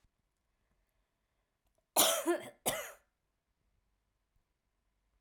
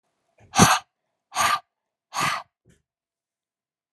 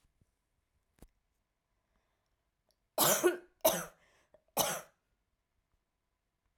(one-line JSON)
{"cough_length": "5.2 s", "cough_amplitude": 7847, "cough_signal_mean_std_ratio": 0.26, "exhalation_length": "3.9 s", "exhalation_amplitude": 32631, "exhalation_signal_mean_std_ratio": 0.3, "three_cough_length": "6.6 s", "three_cough_amplitude": 6315, "three_cough_signal_mean_std_ratio": 0.26, "survey_phase": "alpha (2021-03-01 to 2021-08-12)", "age": "18-44", "gender": "Female", "wearing_mask": "No", "symptom_cough_any": true, "symptom_fatigue": true, "symptom_headache": true, "smoker_status": "Never smoked", "respiratory_condition_asthma": false, "respiratory_condition_other": false, "recruitment_source": "Test and Trace", "submission_delay": "2 days", "covid_test_result": "Positive", "covid_test_method": "RT-qPCR"}